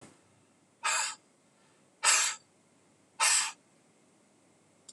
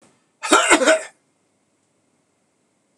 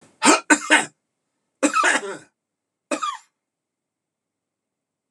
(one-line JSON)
{"exhalation_length": "4.9 s", "exhalation_amplitude": 11251, "exhalation_signal_mean_std_ratio": 0.35, "cough_length": "3.0 s", "cough_amplitude": 26028, "cough_signal_mean_std_ratio": 0.33, "three_cough_length": "5.1 s", "three_cough_amplitude": 26028, "three_cough_signal_mean_std_ratio": 0.33, "survey_phase": "beta (2021-08-13 to 2022-03-07)", "age": "65+", "gender": "Male", "wearing_mask": "No", "symptom_none": true, "smoker_status": "Never smoked", "respiratory_condition_asthma": false, "respiratory_condition_other": false, "recruitment_source": "REACT", "submission_delay": "2 days", "covid_test_result": "Negative", "covid_test_method": "RT-qPCR", "influenza_a_test_result": "Negative", "influenza_b_test_result": "Negative"}